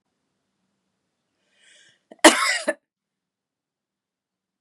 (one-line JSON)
{"cough_length": "4.6 s", "cough_amplitude": 32768, "cough_signal_mean_std_ratio": 0.18, "survey_phase": "beta (2021-08-13 to 2022-03-07)", "age": "45-64", "gender": "Female", "wearing_mask": "No", "symptom_fatigue": true, "smoker_status": "Never smoked", "respiratory_condition_asthma": true, "respiratory_condition_other": false, "recruitment_source": "Test and Trace", "submission_delay": "2 days", "covid_test_result": "Negative", "covid_test_method": "LAMP"}